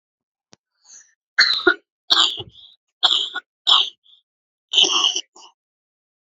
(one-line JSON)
{"three_cough_length": "6.3 s", "three_cough_amplitude": 32768, "three_cough_signal_mean_std_ratio": 0.37, "survey_phase": "beta (2021-08-13 to 2022-03-07)", "age": "18-44", "gender": "Female", "wearing_mask": "No", "symptom_cough_any": true, "symptom_runny_or_blocked_nose": true, "symptom_sore_throat": true, "symptom_abdominal_pain": true, "symptom_diarrhoea": true, "symptom_headache": true, "symptom_onset": "4 days", "smoker_status": "Never smoked", "respiratory_condition_asthma": false, "respiratory_condition_other": false, "recruitment_source": "Test and Trace", "submission_delay": "1 day", "covid_test_result": "Positive", "covid_test_method": "RT-qPCR", "covid_ct_value": 31.2, "covid_ct_gene": "ORF1ab gene"}